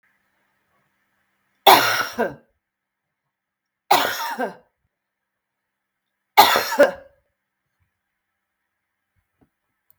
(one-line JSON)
{"three_cough_length": "10.0 s", "three_cough_amplitude": 32497, "three_cough_signal_mean_std_ratio": 0.26, "survey_phase": "beta (2021-08-13 to 2022-03-07)", "age": "45-64", "gender": "Female", "wearing_mask": "No", "symptom_cough_any": true, "symptom_runny_or_blocked_nose": true, "symptom_fatigue": true, "symptom_headache": true, "symptom_onset": "3 days", "smoker_status": "Never smoked", "respiratory_condition_asthma": false, "respiratory_condition_other": false, "recruitment_source": "Test and Trace", "submission_delay": "2 days", "covid_test_result": "Negative", "covid_test_method": "ePCR"}